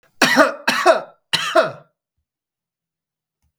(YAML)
three_cough_length: 3.6 s
three_cough_amplitude: 32768
three_cough_signal_mean_std_ratio: 0.39
survey_phase: beta (2021-08-13 to 2022-03-07)
age: 45-64
gender: Male
wearing_mask: 'No'
symptom_none: true
smoker_status: Ex-smoker
respiratory_condition_asthma: true
respiratory_condition_other: false
recruitment_source: REACT
submission_delay: 3 days
covid_test_result: Negative
covid_test_method: RT-qPCR
influenza_a_test_result: Negative
influenza_b_test_result: Negative